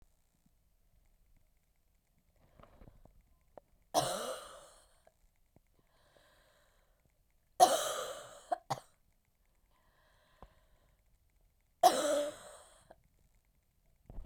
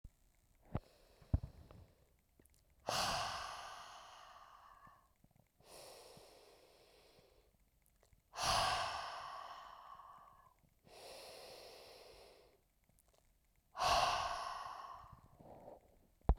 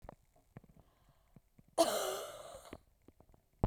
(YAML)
three_cough_length: 14.3 s
three_cough_amplitude: 10736
three_cough_signal_mean_std_ratio: 0.24
exhalation_length: 16.4 s
exhalation_amplitude: 4962
exhalation_signal_mean_std_ratio: 0.39
cough_length: 3.7 s
cough_amplitude: 6241
cough_signal_mean_std_ratio: 0.32
survey_phase: beta (2021-08-13 to 2022-03-07)
age: 18-44
gender: Female
wearing_mask: 'No'
symptom_cough_any: true
symptom_runny_or_blocked_nose: true
symptom_sore_throat: true
symptom_change_to_sense_of_smell_or_taste: true
smoker_status: Ex-smoker
respiratory_condition_asthma: false
respiratory_condition_other: false
recruitment_source: Test and Trace
submission_delay: 2 days
covid_test_result: Positive
covid_test_method: RT-qPCR
covid_ct_value: 25.6
covid_ct_gene: ORF1ab gene